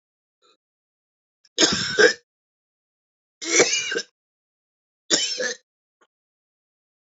{"three_cough_length": "7.2 s", "three_cough_amplitude": 28697, "three_cough_signal_mean_std_ratio": 0.32, "survey_phase": "alpha (2021-03-01 to 2021-08-12)", "age": "18-44", "gender": "Male", "wearing_mask": "No", "symptom_cough_any": true, "symptom_fatigue": true, "symptom_fever_high_temperature": true, "smoker_status": "Never smoked", "respiratory_condition_asthma": false, "respiratory_condition_other": false, "recruitment_source": "Test and Trace", "submission_delay": "3 days", "covid_test_method": "RT-qPCR", "covid_ct_value": 32.5, "covid_ct_gene": "N gene", "covid_ct_mean": 32.5, "covid_viral_load": "22 copies/ml", "covid_viral_load_category": "Minimal viral load (< 10K copies/ml)"}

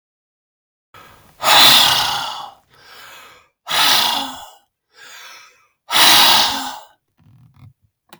{"exhalation_length": "8.2 s", "exhalation_amplitude": 32768, "exhalation_signal_mean_std_ratio": 0.43, "survey_phase": "beta (2021-08-13 to 2022-03-07)", "age": "45-64", "gender": "Male", "wearing_mask": "No", "symptom_none": true, "smoker_status": "Never smoked", "respiratory_condition_asthma": false, "respiratory_condition_other": false, "recruitment_source": "REACT", "submission_delay": "2 days", "covid_test_result": "Negative", "covid_test_method": "RT-qPCR", "influenza_a_test_result": "Negative", "influenza_b_test_result": "Negative"}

